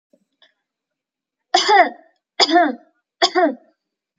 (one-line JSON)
{"three_cough_length": "4.2 s", "three_cough_amplitude": 29909, "three_cough_signal_mean_std_ratio": 0.37, "survey_phase": "alpha (2021-03-01 to 2021-08-12)", "age": "18-44", "gender": "Female", "wearing_mask": "No", "symptom_none": true, "smoker_status": "Never smoked", "respiratory_condition_asthma": false, "respiratory_condition_other": false, "recruitment_source": "REACT", "submission_delay": "6 days", "covid_test_result": "Negative", "covid_test_method": "RT-qPCR"}